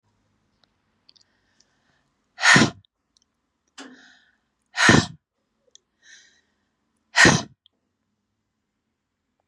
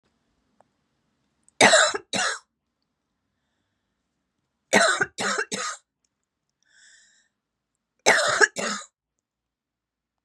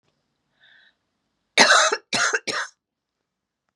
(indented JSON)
{
  "exhalation_length": "9.5 s",
  "exhalation_amplitude": 29714,
  "exhalation_signal_mean_std_ratio": 0.23,
  "three_cough_length": "10.2 s",
  "three_cough_amplitude": 30249,
  "three_cough_signal_mean_std_ratio": 0.31,
  "cough_length": "3.8 s",
  "cough_amplitude": 31063,
  "cough_signal_mean_std_ratio": 0.34,
  "survey_phase": "beta (2021-08-13 to 2022-03-07)",
  "age": "45-64",
  "gender": "Female",
  "wearing_mask": "No",
  "symptom_cough_any": true,
  "symptom_runny_or_blocked_nose": true,
  "symptom_sore_throat": true,
  "symptom_fatigue": true,
  "symptom_headache": true,
  "symptom_change_to_sense_of_smell_or_taste": true,
  "symptom_onset": "3 days",
  "smoker_status": "Current smoker (e-cigarettes or vapes only)",
  "respiratory_condition_asthma": false,
  "respiratory_condition_other": false,
  "recruitment_source": "Test and Trace",
  "submission_delay": "2 days",
  "covid_test_result": "Positive",
  "covid_test_method": "RT-qPCR",
  "covid_ct_value": 25.4,
  "covid_ct_gene": "ORF1ab gene"
}